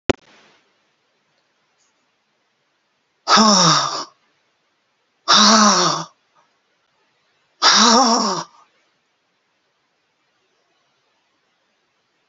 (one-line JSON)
{"exhalation_length": "12.3 s", "exhalation_amplitude": 32767, "exhalation_signal_mean_std_ratio": 0.34, "survey_phase": "beta (2021-08-13 to 2022-03-07)", "age": "65+", "gender": "Female", "wearing_mask": "No", "symptom_none": true, "smoker_status": "Ex-smoker", "respiratory_condition_asthma": true, "respiratory_condition_other": false, "recruitment_source": "Test and Trace", "submission_delay": "1 day", "covid_test_result": "Negative", "covid_test_method": "RT-qPCR"}